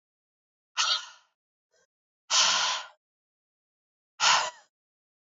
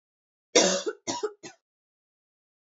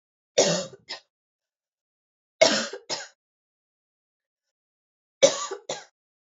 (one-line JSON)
{"exhalation_length": "5.4 s", "exhalation_amplitude": 12352, "exhalation_signal_mean_std_ratio": 0.35, "cough_length": "2.6 s", "cough_amplitude": 19290, "cough_signal_mean_std_ratio": 0.31, "three_cough_length": "6.4 s", "three_cough_amplitude": 23796, "three_cough_signal_mean_std_ratio": 0.26, "survey_phase": "alpha (2021-03-01 to 2021-08-12)", "age": "18-44", "gender": "Female", "wearing_mask": "No", "symptom_cough_any": true, "symptom_shortness_of_breath": true, "symptom_abdominal_pain": true, "symptom_fatigue": true, "symptom_fever_high_temperature": true, "smoker_status": "Prefer not to say", "respiratory_condition_asthma": true, "respiratory_condition_other": false, "recruitment_source": "Test and Trace", "submission_delay": "4 days", "covid_test_result": "Positive", "covid_test_method": "RT-qPCR", "covid_ct_value": 27.8, "covid_ct_gene": "ORF1ab gene"}